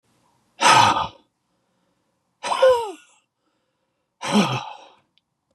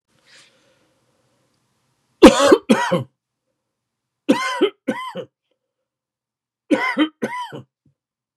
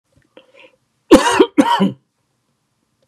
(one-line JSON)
{"exhalation_length": "5.5 s", "exhalation_amplitude": 27968, "exhalation_signal_mean_std_ratio": 0.37, "three_cough_length": "8.4 s", "three_cough_amplitude": 32768, "three_cough_signal_mean_std_ratio": 0.3, "cough_length": "3.1 s", "cough_amplitude": 32768, "cough_signal_mean_std_ratio": 0.34, "survey_phase": "beta (2021-08-13 to 2022-03-07)", "age": "45-64", "gender": "Male", "wearing_mask": "No", "symptom_none": true, "smoker_status": "Never smoked", "respiratory_condition_asthma": false, "respiratory_condition_other": false, "recruitment_source": "Test and Trace", "submission_delay": "1 day", "covid_test_result": "Negative", "covid_test_method": "ePCR"}